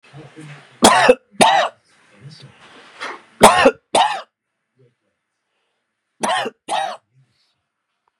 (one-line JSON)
{"three_cough_length": "8.2 s", "three_cough_amplitude": 32768, "three_cough_signal_mean_std_ratio": 0.34, "survey_phase": "beta (2021-08-13 to 2022-03-07)", "age": "45-64", "gender": "Male", "wearing_mask": "No", "symptom_none": true, "smoker_status": "Ex-smoker", "respiratory_condition_asthma": false, "respiratory_condition_other": false, "recruitment_source": "REACT", "submission_delay": "2 days", "covid_test_result": "Negative", "covid_test_method": "RT-qPCR"}